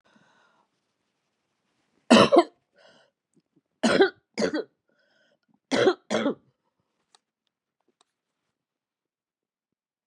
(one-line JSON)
{"three_cough_length": "10.1 s", "three_cough_amplitude": 29138, "three_cough_signal_mean_std_ratio": 0.25, "survey_phase": "beta (2021-08-13 to 2022-03-07)", "age": "65+", "gender": "Male", "wearing_mask": "No", "symptom_cough_any": true, "symptom_runny_or_blocked_nose": true, "symptom_sore_throat": true, "smoker_status": "Never smoked", "respiratory_condition_asthma": false, "respiratory_condition_other": false, "recruitment_source": "Test and Trace", "submission_delay": "3 days", "covid_test_result": "Positive", "covid_test_method": "LFT"}